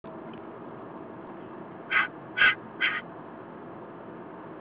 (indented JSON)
{
  "exhalation_length": "4.6 s",
  "exhalation_amplitude": 9771,
  "exhalation_signal_mean_std_ratio": 0.5,
  "survey_phase": "alpha (2021-03-01 to 2021-08-12)",
  "age": "45-64",
  "gender": "Female",
  "wearing_mask": "No",
  "symptom_none": true,
  "smoker_status": "Never smoked",
  "respiratory_condition_asthma": false,
  "respiratory_condition_other": false,
  "recruitment_source": "REACT",
  "submission_delay": "1 day",
  "covid_test_result": "Negative",
  "covid_test_method": "RT-qPCR"
}